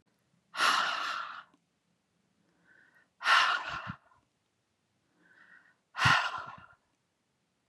{
  "exhalation_length": "7.7 s",
  "exhalation_amplitude": 9983,
  "exhalation_signal_mean_std_ratio": 0.36,
  "survey_phase": "beta (2021-08-13 to 2022-03-07)",
  "age": "45-64",
  "gender": "Female",
  "wearing_mask": "No",
  "symptom_none": true,
  "smoker_status": "Never smoked",
  "respiratory_condition_asthma": false,
  "respiratory_condition_other": false,
  "recruitment_source": "REACT",
  "submission_delay": "2 days",
  "covid_test_result": "Negative",
  "covid_test_method": "RT-qPCR",
  "influenza_a_test_result": "Unknown/Void",
  "influenza_b_test_result": "Unknown/Void"
}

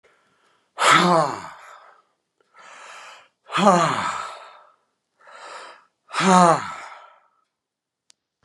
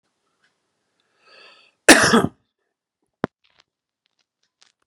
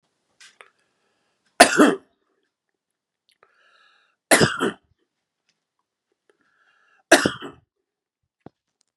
{
  "exhalation_length": "8.4 s",
  "exhalation_amplitude": 31983,
  "exhalation_signal_mean_std_ratio": 0.36,
  "cough_length": "4.9 s",
  "cough_amplitude": 32768,
  "cough_signal_mean_std_ratio": 0.2,
  "three_cough_length": "9.0 s",
  "three_cough_amplitude": 32768,
  "three_cough_signal_mean_std_ratio": 0.21,
  "survey_phase": "beta (2021-08-13 to 2022-03-07)",
  "age": "45-64",
  "gender": "Male",
  "wearing_mask": "No",
  "symptom_runny_or_blocked_nose": true,
  "smoker_status": "Ex-smoker",
  "respiratory_condition_asthma": false,
  "respiratory_condition_other": false,
  "recruitment_source": "REACT",
  "submission_delay": "1 day",
  "covid_test_result": "Negative",
  "covid_test_method": "RT-qPCR"
}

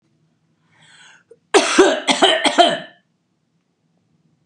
{
  "cough_length": "4.5 s",
  "cough_amplitude": 32767,
  "cough_signal_mean_std_ratio": 0.38,
  "survey_phase": "beta (2021-08-13 to 2022-03-07)",
  "age": "65+",
  "gender": "Female",
  "wearing_mask": "No",
  "symptom_headache": true,
  "symptom_onset": "6 days",
  "smoker_status": "Current smoker (e-cigarettes or vapes only)",
  "respiratory_condition_asthma": false,
  "respiratory_condition_other": false,
  "recruitment_source": "Test and Trace",
  "submission_delay": "3 days",
  "covid_test_result": "Negative",
  "covid_test_method": "RT-qPCR"
}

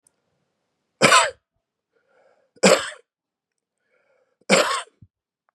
{
  "three_cough_length": "5.5 s",
  "three_cough_amplitude": 32763,
  "three_cough_signal_mean_std_ratio": 0.28,
  "survey_phase": "beta (2021-08-13 to 2022-03-07)",
  "age": "45-64",
  "gender": "Male",
  "wearing_mask": "No",
  "symptom_cough_any": true,
  "symptom_headache": true,
  "symptom_onset": "4 days",
  "smoker_status": "Never smoked",
  "respiratory_condition_asthma": false,
  "respiratory_condition_other": false,
  "recruitment_source": "Test and Trace",
  "submission_delay": "1 day",
  "covid_test_result": "Positive",
  "covid_test_method": "RT-qPCR",
  "covid_ct_value": 18.3,
  "covid_ct_gene": "N gene"
}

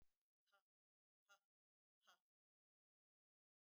{
  "exhalation_length": "3.7 s",
  "exhalation_amplitude": 42,
  "exhalation_signal_mean_std_ratio": 0.24,
  "survey_phase": "beta (2021-08-13 to 2022-03-07)",
  "age": "45-64",
  "gender": "Female",
  "wearing_mask": "No",
  "symptom_none": true,
  "smoker_status": "Never smoked",
  "respiratory_condition_asthma": false,
  "respiratory_condition_other": false,
  "recruitment_source": "REACT",
  "submission_delay": "1 day",
  "covid_test_result": "Negative",
  "covid_test_method": "RT-qPCR",
  "influenza_a_test_result": "Negative",
  "influenza_b_test_result": "Negative"
}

